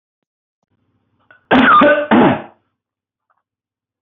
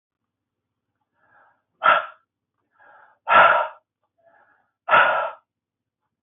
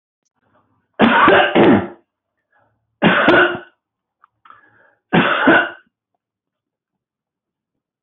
{"cough_length": "4.0 s", "cough_amplitude": 30401, "cough_signal_mean_std_ratio": 0.4, "exhalation_length": "6.2 s", "exhalation_amplitude": 23268, "exhalation_signal_mean_std_ratio": 0.31, "three_cough_length": "8.0 s", "three_cough_amplitude": 28883, "three_cough_signal_mean_std_ratio": 0.41, "survey_phase": "beta (2021-08-13 to 2022-03-07)", "age": "45-64", "gender": "Male", "wearing_mask": "No", "symptom_none": true, "smoker_status": "Never smoked", "respiratory_condition_asthma": false, "respiratory_condition_other": false, "recruitment_source": "REACT", "submission_delay": "2 days", "covid_test_result": "Negative", "covid_test_method": "RT-qPCR"}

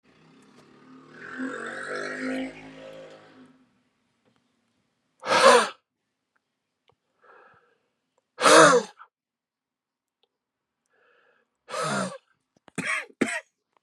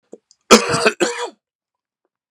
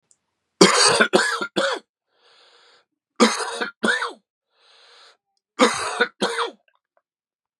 {"exhalation_length": "13.8 s", "exhalation_amplitude": 27026, "exhalation_signal_mean_std_ratio": 0.28, "cough_length": "2.3 s", "cough_amplitude": 32768, "cough_signal_mean_std_ratio": 0.34, "three_cough_length": "7.6 s", "three_cough_amplitude": 32768, "three_cough_signal_mean_std_ratio": 0.4, "survey_phase": "beta (2021-08-13 to 2022-03-07)", "age": "45-64", "gender": "Male", "wearing_mask": "No", "symptom_cough_any": true, "symptom_runny_or_blocked_nose": true, "symptom_sore_throat": true, "symptom_fatigue": true, "symptom_headache": true, "symptom_onset": "3 days", "smoker_status": "Never smoked", "respiratory_condition_asthma": false, "respiratory_condition_other": false, "recruitment_source": "Test and Trace", "submission_delay": "1 day", "covid_test_result": "Positive", "covid_test_method": "RT-qPCR", "covid_ct_value": 28.8, "covid_ct_gene": "ORF1ab gene"}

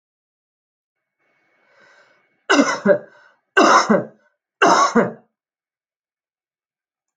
{"three_cough_length": "7.2 s", "three_cough_amplitude": 32768, "three_cough_signal_mean_std_ratio": 0.34, "survey_phase": "beta (2021-08-13 to 2022-03-07)", "age": "45-64", "gender": "Female", "wearing_mask": "No", "symptom_runny_or_blocked_nose": true, "symptom_change_to_sense_of_smell_or_taste": true, "symptom_loss_of_taste": true, "smoker_status": "Never smoked", "respiratory_condition_asthma": false, "respiratory_condition_other": false, "recruitment_source": "Test and Trace", "submission_delay": "2 days", "covid_test_result": "Positive", "covid_test_method": "RT-qPCR", "covid_ct_value": 17.6, "covid_ct_gene": "ORF1ab gene", "covid_ct_mean": 18.0, "covid_viral_load": "1200000 copies/ml", "covid_viral_load_category": "High viral load (>1M copies/ml)"}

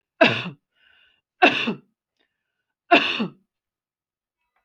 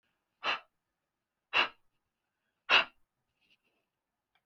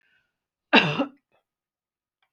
{"three_cough_length": "4.6 s", "three_cough_amplitude": 29514, "three_cough_signal_mean_std_ratio": 0.3, "exhalation_length": "4.5 s", "exhalation_amplitude": 8642, "exhalation_signal_mean_std_ratio": 0.22, "cough_length": "2.3 s", "cough_amplitude": 26779, "cough_signal_mean_std_ratio": 0.25, "survey_phase": "alpha (2021-03-01 to 2021-08-12)", "age": "45-64", "gender": "Female", "wearing_mask": "No", "symptom_none": true, "smoker_status": "Never smoked", "respiratory_condition_asthma": false, "respiratory_condition_other": false, "recruitment_source": "REACT", "submission_delay": "2 days", "covid_test_method": "RT-qPCR"}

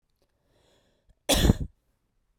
{"cough_length": "2.4 s", "cough_amplitude": 21329, "cough_signal_mean_std_ratio": 0.27, "survey_phase": "beta (2021-08-13 to 2022-03-07)", "age": "18-44", "gender": "Female", "wearing_mask": "No", "symptom_cough_any": true, "symptom_runny_or_blocked_nose": true, "symptom_shortness_of_breath": true, "symptom_sore_throat": true, "symptom_fatigue": true, "symptom_fever_high_temperature": true, "symptom_headache": true, "symptom_change_to_sense_of_smell_or_taste": true, "smoker_status": "Never smoked", "respiratory_condition_asthma": false, "respiratory_condition_other": false, "recruitment_source": "Test and Trace", "submission_delay": "2 days", "covid_test_result": "Positive", "covid_test_method": "RT-qPCR"}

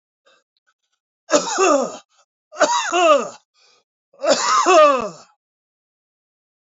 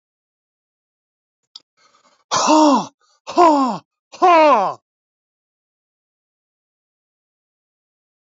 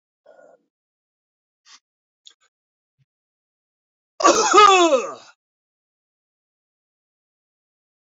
{"three_cough_length": "6.7 s", "three_cough_amplitude": 26649, "three_cough_signal_mean_std_ratio": 0.44, "exhalation_length": "8.4 s", "exhalation_amplitude": 26602, "exhalation_signal_mean_std_ratio": 0.34, "cough_length": "8.0 s", "cough_amplitude": 26760, "cough_signal_mean_std_ratio": 0.25, "survey_phase": "beta (2021-08-13 to 2022-03-07)", "age": "65+", "gender": "Male", "wearing_mask": "No", "symptom_none": true, "smoker_status": "Ex-smoker", "respiratory_condition_asthma": false, "respiratory_condition_other": false, "recruitment_source": "REACT", "submission_delay": "2 days", "covid_test_result": "Negative", "covid_test_method": "RT-qPCR"}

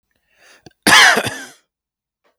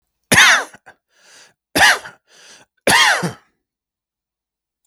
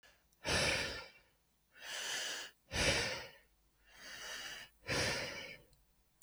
{"cough_length": "2.4 s", "cough_amplitude": 32768, "cough_signal_mean_std_ratio": 0.34, "three_cough_length": "4.9 s", "three_cough_amplitude": 32768, "three_cough_signal_mean_std_ratio": 0.36, "exhalation_length": "6.2 s", "exhalation_amplitude": 3187, "exhalation_signal_mean_std_ratio": 0.56, "survey_phase": "beta (2021-08-13 to 2022-03-07)", "age": "45-64", "gender": "Male", "wearing_mask": "No", "symptom_none": true, "symptom_onset": "12 days", "smoker_status": "Ex-smoker", "respiratory_condition_asthma": false, "respiratory_condition_other": false, "recruitment_source": "REACT", "submission_delay": "4 days", "covid_test_result": "Negative", "covid_test_method": "RT-qPCR"}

